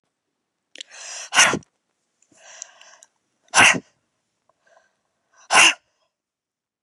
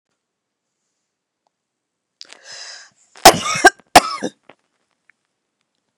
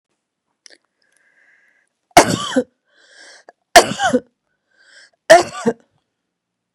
exhalation_length: 6.8 s
exhalation_amplitude: 32203
exhalation_signal_mean_std_ratio: 0.26
cough_length: 6.0 s
cough_amplitude: 32768
cough_signal_mean_std_ratio: 0.2
three_cough_length: 6.7 s
three_cough_amplitude: 32768
three_cough_signal_mean_std_ratio: 0.25
survey_phase: beta (2021-08-13 to 2022-03-07)
age: 45-64
gender: Female
wearing_mask: 'No'
symptom_none: true
smoker_status: Ex-smoker
respiratory_condition_asthma: false
respiratory_condition_other: false
recruitment_source: REACT
submission_delay: 2 days
covid_test_result: Negative
covid_test_method: RT-qPCR
influenza_a_test_result: Unknown/Void
influenza_b_test_result: Unknown/Void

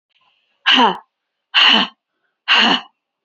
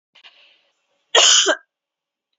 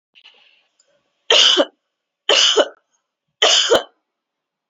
exhalation_length: 3.2 s
exhalation_amplitude: 30839
exhalation_signal_mean_std_ratio: 0.44
cough_length: 2.4 s
cough_amplitude: 32767
cough_signal_mean_std_ratio: 0.34
three_cough_length: 4.7 s
three_cough_amplitude: 29839
three_cough_signal_mean_std_ratio: 0.4
survey_phase: beta (2021-08-13 to 2022-03-07)
age: 18-44
gender: Female
wearing_mask: 'No'
symptom_none: true
smoker_status: Never smoked
respiratory_condition_asthma: false
respiratory_condition_other: false
recruitment_source: REACT
submission_delay: 3 days
covid_test_result: Negative
covid_test_method: RT-qPCR
influenza_a_test_result: Unknown/Void
influenza_b_test_result: Unknown/Void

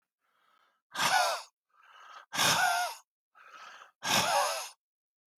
exhalation_length: 5.4 s
exhalation_amplitude: 7046
exhalation_signal_mean_std_ratio: 0.48
survey_phase: alpha (2021-03-01 to 2021-08-12)
age: 45-64
gender: Male
wearing_mask: 'No'
symptom_none: true
smoker_status: Ex-smoker
respiratory_condition_asthma: false
respiratory_condition_other: false
recruitment_source: REACT
submission_delay: 1 day
covid_test_result: Negative
covid_test_method: RT-qPCR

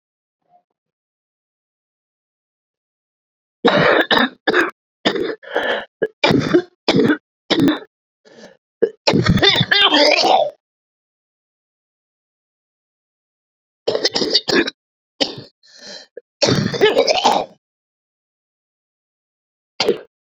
three_cough_length: 20.2 s
three_cough_amplitude: 32768
three_cough_signal_mean_std_ratio: 0.42
survey_phase: beta (2021-08-13 to 2022-03-07)
age: 45-64
gender: Female
wearing_mask: 'No'
symptom_cough_any: true
symptom_runny_or_blocked_nose: true
symptom_sore_throat: true
symptom_fatigue: true
symptom_fever_high_temperature: true
symptom_headache: true
symptom_change_to_sense_of_smell_or_taste: true
symptom_onset: 2 days
smoker_status: Ex-smoker
respiratory_condition_asthma: true
respiratory_condition_other: true
recruitment_source: Test and Trace
submission_delay: 2 days
covid_test_result: Positive
covid_test_method: RT-qPCR
covid_ct_value: 13.1
covid_ct_gene: ORF1ab gene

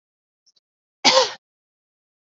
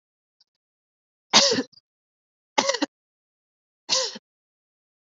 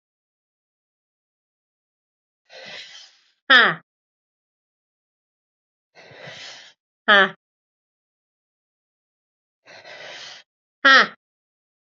cough_length: 2.3 s
cough_amplitude: 29744
cough_signal_mean_std_ratio: 0.25
three_cough_length: 5.1 s
three_cough_amplitude: 29594
three_cough_signal_mean_std_ratio: 0.27
exhalation_length: 11.9 s
exhalation_amplitude: 32357
exhalation_signal_mean_std_ratio: 0.19
survey_phase: beta (2021-08-13 to 2022-03-07)
age: 18-44
gender: Female
wearing_mask: 'No'
symptom_cough_any: true
symptom_runny_or_blocked_nose: true
smoker_status: Never smoked
respiratory_condition_asthma: false
respiratory_condition_other: false
recruitment_source: Test and Trace
submission_delay: 2 days
covid_test_result: Positive
covid_test_method: ePCR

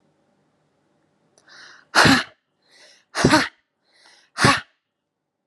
exhalation_length: 5.5 s
exhalation_amplitude: 31285
exhalation_signal_mean_std_ratio: 0.29
survey_phase: alpha (2021-03-01 to 2021-08-12)
age: 45-64
gender: Female
wearing_mask: 'Yes'
symptom_none: true
smoker_status: Ex-smoker
respiratory_condition_asthma: false
respiratory_condition_other: false
recruitment_source: Test and Trace
submission_delay: 0 days
covid_test_result: Negative
covid_test_method: LFT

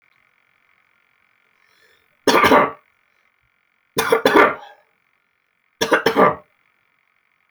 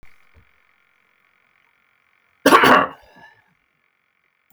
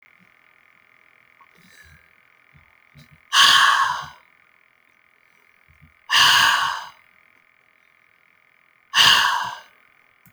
three_cough_length: 7.5 s
three_cough_amplitude: 32767
three_cough_signal_mean_std_ratio: 0.33
cough_length: 4.5 s
cough_amplitude: 30876
cough_signal_mean_std_ratio: 0.25
exhalation_length: 10.3 s
exhalation_amplitude: 30592
exhalation_signal_mean_std_ratio: 0.35
survey_phase: alpha (2021-03-01 to 2021-08-12)
age: 45-64
gender: Male
wearing_mask: 'No'
symptom_none: true
smoker_status: Never smoked
respiratory_condition_asthma: false
respiratory_condition_other: false
recruitment_source: REACT
submission_delay: 2 days
covid_test_result: Negative
covid_test_method: RT-qPCR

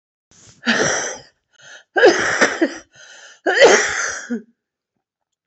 exhalation_length: 5.5 s
exhalation_amplitude: 32265
exhalation_signal_mean_std_ratio: 0.46
survey_phase: alpha (2021-03-01 to 2021-08-12)
age: 45-64
gender: Female
wearing_mask: 'No'
symptom_cough_any: true
symptom_new_continuous_cough: true
symptom_shortness_of_breath: true
symptom_abdominal_pain: true
symptom_fatigue: true
symptom_fever_high_temperature: true
symptom_headache: true
symptom_onset: 3 days
smoker_status: Never smoked
respiratory_condition_asthma: false
respiratory_condition_other: false
recruitment_source: Test and Trace
submission_delay: 2 days
covid_test_result: Positive
covid_test_method: RT-qPCR
covid_ct_value: 24.8
covid_ct_gene: ORF1ab gene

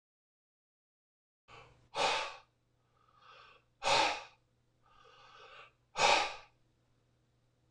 exhalation_length: 7.7 s
exhalation_amplitude: 6743
exhalation_signal_mean_std_ratio: 0.31
survey_phase: alpha (2021-03-01 to 2021-08-12)
age: 45-64
gender: Male
wearing_mask: 'No'
symptom_none: true
smoker_status: Ex-smoker
respiratory_condition_asthma: false
respiratory_condition_other: false
recruitment_source: REACT
submission_delay: 2 days
covid_test_result: Negative
covid_test_method: RT-qPCR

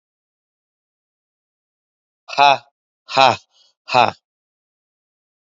exhalation_length: 5.5 s
exhalation_amplitude: 28971
exhalation_signal_mean_std_ratio: 0.23
survey_phase: beta (2021-08-13 to 2022-03-07)
age: 45-64
gender: Male
wearing_mask: 'No'
symptom_cough_any: true
symptom_shortness_of_breath: true
symptom_other: true
symptom_onset: 8 days
smoker_status: Never smoked
respiratory_condition_asthma: true
respiratory_condition_other: false
recruitment_source: Test and Trace
submission_delay: 2 days
covid_test_result: Negative
covid_test_method: ePCR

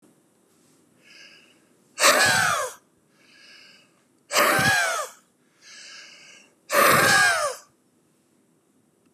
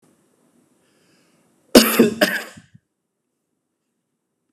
exhalation_length: 9.1 s
exhalation_amplitude: 21637
exhalation_signal_mean_std_ratio: 0.43
cough_length: 4.5 s
cough_amplitude: 32768
cough_signal_mean_std_ratio: 0.24
survey_phase: beta (2021-08-13 to 2022-03-07)
age: 45-64
gender: Male
wearing_mask: 'No'
symptom_none: true
smoker_status: Never smoked
respiratory_condition_asthma: false
respiratory_condition_other: false
recruitment_source: REACT
submission_delay: 1 day
covid_test_result: Negative
covid_test_method: RT-qPCR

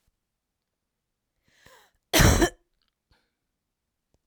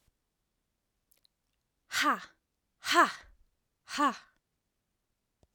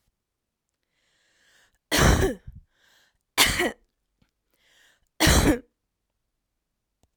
cough_length: 4.3 s
cough_amplitude: 18769
cough_signal_mean_std_ratio: 0.23
exhalation_length: 5.5 s
exhalation_amplitude: 9018
exhalation_signal_mean_std_ratio: 0.27
three_cough_length: 7.2 s
three_cough_amplitude: 22876
three_cough_signal_mean_std_ratio: 0.31
survey_phase: alpha (2021-03-01 to 2021-08-12)
age: 18-44
gender: Female
wearing_mask: 'No'
symptom_headache: true
smoker_status: Never smoked
respiratory_condition_asthma: true
respiratory_condition_other: false
recruitment_source: Test and Trace
submission_delay: 1 day
covid_test_result: Positive
covid_test_method: RT-qPCR
covid_ct_value: 26.0
covid_ct_gene: ORF1ab gene
covid_ct_mean: 26.6
covid_viral_load: 1900 copies/ml
covid_viral_load_category: Minimal viral load (< 10K copies/ml)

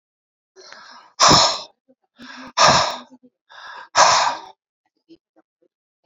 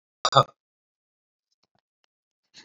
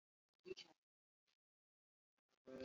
exhalation_length: 6.1 s
exhalation_amplitude: 32767
exhalation_signal_mean_std_ratio: 0.36
three_cough_length: 2.6 s
three_cough_amplitude: 26931
three_cough_signal_mean_std_ratio: 0.16
cough_length: 2.6 s
cough_amplitude: 323
cough_signal_mean_std_ratio: 0.26
survey_phase: beta (2021-08-13 to 2022-03-07)
age: 45-64
gender: Female
wearing_mask: 'No'
symptom_cough_any: true
symptom_runny_or_blocked_nose: true
symptom_sore_throat: true
symptom_fatigue: true
symptom_fever_high_temperature: true
symptom_headache: true
symptom_change_to_sense_of_smell_or_taste: true
symptom_loss_of_taste: true
smoker_status: Ex-smoker
respiratory_condition_asthma: false
respiratory_condition_other: false
recruitment_source: Test and Trace
submission_delay: 2 days
covid_test_result: Positive
covid_test_method: RT-qPCR
covid_ct_value: 20.4
covid_ct_gene: ORF1ab gene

